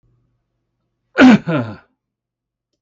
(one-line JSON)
{"cough_length": "2.8 s", "cough_amplitude": 32768, "cough_signal_mean_std_ratio": 0.29, "survey_phase": "beta (2021-08-13 to 2022-03-07)", "age": "65+", "gender": "Male", "wearing_mask": "No", "symptom_none": true, "smoker_status": "Ex-smoker", "respiratory_condition_asthma": false, "respiratory_condition_other": false, "recruitment_source": "REACT", "submission_delay": "2 days", "covid_test_result": "Negative", "covid_test_method": "RT-qPCR"}